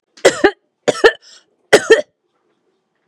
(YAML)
three_cough_length: 3.1 s
three_cough_amplitude: 32768
three_cough_signal_mean_std_ratio: 0.31
survey_phase: beta (2021-08-13 to 2022-03-07)
age: 45-64
gender: Female
wearing_mask: 'No'
symptom_none: true
smoker_status: Never smoked
respiratory_condition_asthma: false
respiratory_condition_other: false
recruitment_source: REACT
submission_delay: 1 day
covid_test_result: Negative
covid_test_method: RT-qPCR
influenza_a_test_result: Negative
influenza_b_test_result: Negative